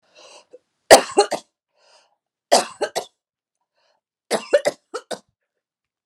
{"three_cough_length": "6.1 s", "three_cough_amplitude": 32768, "three_cough_signal_mean_std_ratio": 0.24, "survey_phase": "alpha (2021-03-01 to 2021-08-12)", "age": "45-64", "gender": "Female", "wearing_mask": "No", "symptom_none": true, "symptom_onset": "12 days", "smoker_status": "Never smoked", "respiratory_condition_asthma": false, "respiratory_condition_other": false, "recruitment_source": "REACT", "submission_delay": "2 days", "covid_test_result": "Negative", "covid_test_method": "RT-qPCR"}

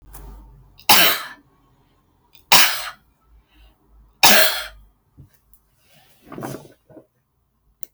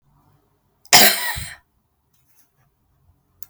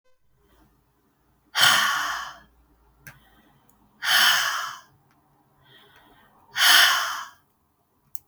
{"three_cough_length": "7.9 s", "three_cough_amplitude": 32768, "three_cough_signal_mean_std_ratio": 0.29, "cough_length": "3.5 s", "cough_amplitude": 32768, "cough_signal_mean_std_ratio": 0.25, "exhalation_length": "8.3 s", "exhalation_amplitude": 24660, "exhalation_signal_mean_std_ratio": 0.38, "survey_phase": "beta (2021-08-13 to 2022-03-07)", "age": "65+", "gender": "Female", "wearing_mask": "No", "symptom_none": true, "smoker_status": "Never smoked", "respiratory_condition_asthma": false, "respiratory_condition_other": false, "recruitment_source": "REACT", "submission_delay": "2 days", "covid_test_result": "Negative", "covid_test_method": "RT-qPCR", "influenza_a_test_result": "Negative", "influenza_b_test_result": "Negative"}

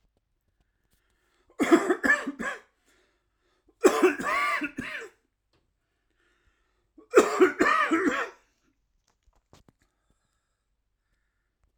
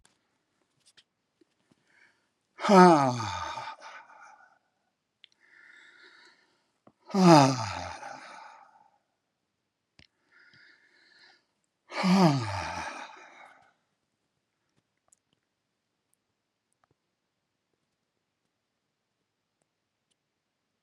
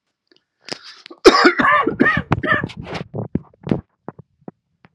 {"three_cough_length": "11.8 s", "three_cough_amplitude": 18381, "three_cough_signal_mean_std_ratio": 0.34, "exhalation_length": "20.8 s", "exhalation_amplitude": 23489, "exhalation_signal_mean_std_ratio": 0.23, "cough_length": "4.9 s", "cough_amplitude": 32768, "cough_signal_mean_std_ratio": 0.41, "survey_phase": "alpha (2021-03-01 to 2021-08-12)", "age": "65+", "gender": "Male", "wearing_mask": "No", "symptom_cough_any": true, "symptom_fatigue": true, "symptom_change_to_sense_of_smell_or_taste": true, "symptom_loss_of_taste": true, "symptom_onset": "7 days", "smoker_status": "Never smoked", "respiratory_condition_asthma": true, "respiratory_condition_other": false, "recruitment_source": "Test and Trace", "submission_delay": "1 day", "covid_test_result": "Positive", "covid_test_method": "RT-qPCR", "covid_ct_value": 14.8, "covid_ct_gene": "ORF1ab gene", "covid_ct_mean": 15.1, "covid_viral_load": "11000000 copies/ml", "covid_viral_load_category": "High viral load (>1M copies/ml)"}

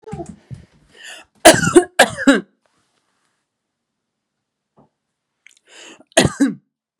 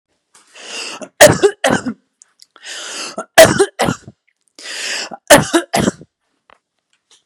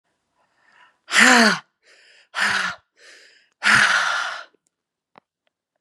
{"cough_length": "7.0 s", "cough_amplitude": 32768, "cough_signal_mean_std_ratio": 0.27, "three_cough_length": "7.3 s", "three_cough_amplitude": 32768, "three_cough_signal_mean_std_ratio": 0.36, "exhalation_length": "5.8 s", "exhalation_amplitude": 32767, "exhalation_signal_mean_std_ratio": 0.4, "survey_phase": "beta (2021-08-13 to 2022-03-07)", "age": "18-44", "gender": "Female", "wearing_mask": "No", "symptom_none": true, "smoker_status": "Never smoked", "respiratory_condition_asthma": true, "respiratory_condition_other": false, "recruitment_source": "REACT", "submission_delay": "2 days", "covid_test_result": "Negative", "covid_test_method": "RT-qPCR", "influenza_a_test_result": "Negative", "influenza_b_test_result": "Negative"}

